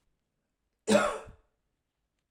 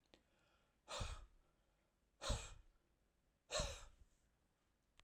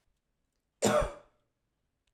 {
  "cough_length": "2.3 s",
  "cough_amplitude": 10509,
  "cough_signal_mean_std_ratio": 0.28,
  "exhalation_length": "5.0 s",
  "exhalation_amplitude": 1350,
  "exhalation_signal_mean_std_ratio": 0.35,
  "three_cough_length": "2.1 s",
  "three_cough_amplitude": 6761,
  "three_cough_signal_mean_std_ratio": 0.3,
  "survey_phase": "alpha (2021-03-01 to 2021-08-12)",
  "age": "65+",
  "gender": "Male",
  "wearing_mask": "No",
  "symptom_none": true,
  "smoker_status": "Ex-smoker",
  "respiratory_condition_asthma": false,
  "respiratory_condition_other": false,
  "recruitment_source": "REACT",
  "submission_delay": "1 day",
  "covid_test_result": "Negative",
  "covid_test_method": "RT-qPCR"
}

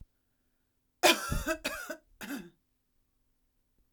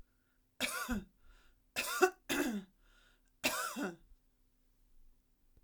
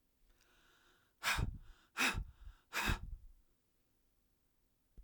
{
  "cough_length": "3.9 s",
  "cough_amplitude": 12118,
  "cough_signal_mean_std_ratio": 0.3,
  "three_cough_length": "5.6 s",
  "three_cough_amplitude": 6892,
  "three_cough_signal_mean_std_ratio": 0.4,
  "exhalation_length": "5.0 s",
  "exhalation_amplitude": 2744,
  "exhalation_signal_mean_std_ratio": 0.38,
  "survey_phase": "alpha (2021-03-01 to 2021-08-12)",
  "age": "45-64",
  "gender": "Female",
  "wearing_mask": "No",
  "symptom_none": true,
  "smoker_status": "Ex-smoker",
  "respiratory_condition_asthma": true,
  "respiratory_condition_other": false,
  "recruitment_source": "REACT",
  "submission_delay": "1 day",
  "covid_test_result": "Negative",
  "covid_test_method": "RT-qPCR",
  "covid_ct_value": 47.0,
  "covid_ct_gene": "N gene"
}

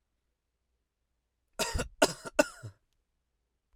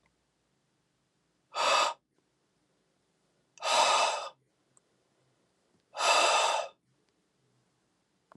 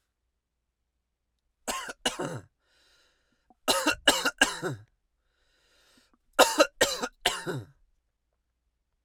{
  "three_cough_length": "3.8 s",
  "three_cough_amplitude": 12278,
  "three_cough_signal_mean_std_ratio": 0.23,
  "exhalation_length": "8.4 s",
  "exhalation_amplitude": 7792,
  "exhalation_signal_mean_std_ratio": 0.37,
  "cough_length": "9.0 s",
  "cough_amplitude": 21279,
  "cough_signal_mean_std_ratio": 0.3,
  "survey_phase": "alpha (2021-03-01 to 2021-08-12)",
  "age": "18-44",
  "gender": "Male",
  "wearing_mask": "No",
  "symptom_none": true,
  "smoker_status": "Never smoked",
  "respiratory_condition_asthma": false,
  "respiratory_condition_other": false,
  "recruitment_source": "REACT",
  "submission_delay": "2 days",
  "covid_test_result": "Negative",
  "covid_test_method": "RT-qPCR"
}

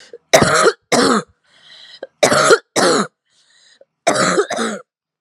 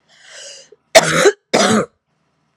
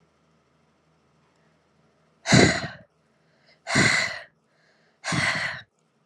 {
  "three_cough_length": "5.2 s",
  "three_cough_amplitude": 32768,
  "three_cough_signal_mean_std_ratio": 0.51,
  "cough_length": "2.6 s",
  "cough_amplitude": 32768,
  "cough_signal_mean_std_ratio": 0.41,
  "exhalation_length": "6.1 s",
  "exhalation_amplitude": 23201,
  "exhalation_signal_mean_std_ratio": 0.35,
  "survey_phase": "alpha (2021-03-01 to 2021-08-12)",
  "age": "18-44",
  "gender": "Female",
  "wearing_mask": "No",
  "symptom_cough_any": true,
  "symptom_fatigue": true,
  "symptom_fever_high_temperature": true,
  "symptom_headache": true,
  "symptom_change_to_sense_of_smell_or_taste": true,
  "symptom_loss_of_taste": true,
  "symptom_onset": "9 days",
  "smoker_status": "Ex-smoker",
  "respiratory_condition_asthma": false,
  "respiratory_condition_other": false,
  "recruitment_source": "Test and Trace",
  "submission_delay": "2 days",
  "covid_test_result": "Positive",
  "covid_test_method": "RT-qPCR",
  "covid_ct_value": 26.1,
  "covid_ct_gene": "ORF1ab gene"
}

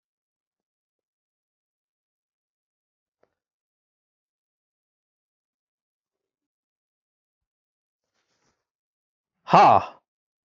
{
  "exhalation_length": "10.6 s",
  "exhalation_amplitude": 26351,
  "exhalation_signal_mean_std_ratio": 0.14,
  "survey_phase": "beta (2021-08-13 to 2022-03-07)",
  "age": "65+",
  "gender": "Male",
  "wearing_mask": "No",
  "symptom_none": true,
  "smoker_status": "Ex-smoker",
  "respiratory_condition_asthma": false,
  "respiratory_condition_other": false,
  "recruitment_source": "REACT",
  "submission_delay": "1 day",
  "covid_test_result": "Negative",
  "covid_test_method": "RT-qPCR"
}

